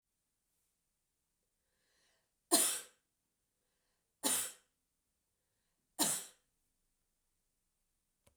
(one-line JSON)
{"three_cough_length": "8.4 s", "three_cough_amplitude": 8380, "three_cough_signal_mean_std_ratio": 0.23, "survey_phase": "beta (2021-08-13 to 2022-03-07)", "age": "65+", "gender": "Female", "wearing_mask": "No", "symptom_none": true, "smoker_status": "Never smoked", "respiratory_condition_asthma": false, "respiratory_condition_other": false, "recruitment_source": "REACT", "submission_delay": "2 days", "covid_test_result": "Negative", "covid_test_method": "RT-qPCR", "influenza_a_test_result": "Negative", "influenza_b_test_result": "Negative"}